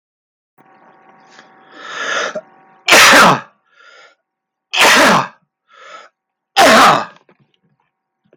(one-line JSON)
{"three_cough_length": "8.4 s", "three_cough_amplitude": 32768, "three_cough_signal_mean_std_ratio": 0.42, "survey_phase": "beta (2021-08-13 to 2022-03-07)", "age": "45-64", "gender": "Male", "wearing_mask": "No", "symptom_runny_or_blocked_nose": true, "smoker_status": "Never smoked", "respiratory_condition_asthma": false, "respiratory_condition_other": false, "recruitment_source": "REACT", "submission_delay": "4 days", "covid_test_result": "Negative", "covid_test_method": "RT-qPCR"}